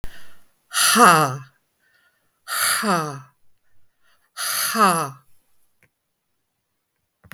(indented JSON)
{
  "exhalation_length": "7.3 s",
  "exhalation_amplitude": 32766,
  "exhalation_signal_mean_std_ratio": 0.41,
  "survey_phase": "beta (2021-08-13 to 2022-03-07)",
  "age": "65+",
  "gender": "Female",
  "wearing_mask": "No",
  "symptom_none": true,
  "smoker_status": "Never smoked",
  "respiratory_condition_asthma": false,
  "respiratory_condition_other": false,
  "recruitment_source": "REACT",
  "submission_delay": "1 day",
  "covid_test_result": "Negative",
  "covid_test_method": "RT-qPCR",
  "influenza_a_test_result": "Negative",
  "influenza_b_test_result": "Negative"
}